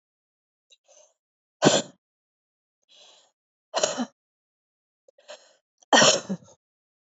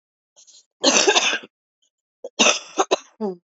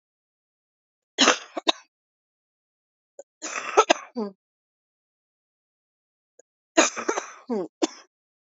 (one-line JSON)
{"exhalation_length": "7.2 s", "exhalation_amplitude": 25043, "exhalation_signal_mean_std_ratio": 0.24, "cough_length": "3.6 s", "cough_amplitude": 30641, "cough_signal_mean_std_ratio": 0.41, "three_cough_length": "8.4 s", "three_cough_amplitude": 27478, "three_cough_signal_mean_std_ratio": 0.25, "survey_phase": "alpha (2021-03-01 to 2021-08-12)", "age": "45-64", "gender": "Female", "wearing_mask": "No", "symptom_cough_any": true, "symptom_new_continuous_cough": true, "symptom_shortness_of_breath": true, "symptom_abdominal_pain": true, "symptom_diarrhoea": true, "symptom_fatigue": true, "symptom_fever_high_temperature": true, "symptom_headache": true, "symptom_onset": "5 days", "smoker_status": "Ex-smoker", "respiratory_condition_asthma": false, "respiratory_condition_other": false, "recruitment_source": "Test and Trace", "submission_delay": "1 day", "covid_test_result": "Positive", "covid_test_method": "RT-qPCR", "covid_ct_value": 15.5, "covid_ct_gene": "ORF1ab gene", "covid_ct_mean": 16.1, "covid_viral_load": "5100000 copies/ml", "covid_viral_load_category": "High viral load (>1M copies/ml)"}